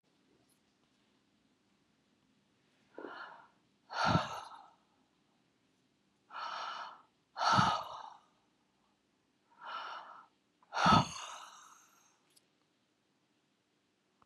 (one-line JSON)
{"exhalation_length": "14.3 s", "exhalation_amplitude": 6967, "exhalation_signal_mean_std_ratio": 0.29, "survey_phase": "beta (2021-08-13 to 2022-03-07)", "age": "65+", "gender": "Female", "wearing_mask": "No", "symptom_fatigue": true, "symptom_headache": true, "symptom_onset": "12 days", "smoker_status": "Ex-smoker", "respiratory_condition_asthma": false, "respiratory_condition_other": false, "recruitment_source": "REACT", "submission_delay": "2 days", "covid_test_result": "Negative", "covid_test_method": "RT-qPCR", "influenza_a_test_result": "Negative", "influenza_b_test_result": "Negative"}